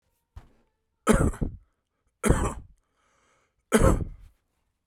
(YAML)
three_cough_length: 4.9 s
three_cough_amplitude: 18393
three_cough_signal_mean_std_ratio: 0.34
survey_phase: beta (2021-08-13 to 2022-03-07)
age: 45-64
gender: Male
wearing_mask: 'No'
symptom_cough_any: true
symptom_sore_throat: true
symptom_fatigue: true
symptom_headache: true
smoker_status: Ex-smoker
respiratory_condition_asthma: false
respiratory_condition_other: false
recruitment_source: Test and Trace
submission_delay: 2 days
covid_test_result: Positive
covid_test_method: RT-qPCR
covid_ct_value: 20.7
covid_ct_gene: ORF1ab gene
covid_ct_mean: 21.3
covid_viral_load: 100000 copies/ml
covid_viral_load_category: Low viral load (10K-1M copies/ml)